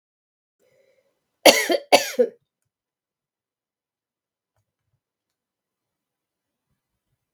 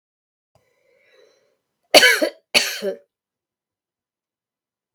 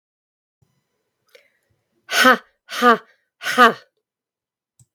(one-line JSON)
{"cough_length": "7.3 s", "cough_amplitude": 32768, "cough_signal_mean_std_ratio": 0.18, "three_cough_length": "4.9 s", "three_cough_amplitude": 32768, "three_cough_signal_mean_std_ratio": 0.24, "exhalation_length": "4.9 s", "exhalation_amplitude": 32766, "exhalation_signal_mean_std_ratio": 0.27, "survey_phase": "beta (2021-08-13 to 2022-03-07)", "age": "65+", "gender": "Female", "wearing_mask": "No", "symptom_none": true, "smoker_status": "Ex-smoker", "respiratory_condition_asthma": false, "respiratory_condition_other": false, "recruitment_source": "REACT", "submission_delay": "4 days", "covid_test_result": "Negative", "covid_test_method": "RT-qPCR", "influenza_a_test_result": "Negative", "influenza_b_test_result": "Negative"}